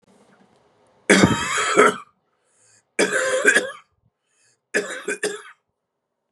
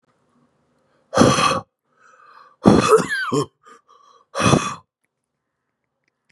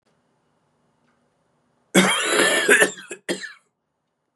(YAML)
three_cough_length: 6.3 s
three_cough_amplitude: 32724
three_cough_signal_mean_std_ratio: 0.41
exhalation_length: 6.3 s
exhalation_amplitude: 32768
exhalation_signal_mean_std_ratio: 0.37
cough_length: 4.4 s
cough_amplitude: 28497
cough_signal_mean_std_ratio: 0.39
survey_phase: beta (2021-08-13 to 2022-03-07)
age: 18-44
gender: Male
wearing_mask: 'Yes'
symptom_cough_any: true
symptom_runny_or_blocked_nose: true
symptom_shortness_of_breath: true
symptom_sore_throat: true
symptom_onset: 13 days
smoker_status: Current smoker (e-cigarettes or vapes only)
respiratory_condition_asthma: false
respiratory_condition_other: false
recruitment_source: REACT
submission_delay: 4 days
covid_test_result: Negative
covid_test_method: RT-qPCR
influenza_a_test_result: Negative
influenza_b_test_result: Negative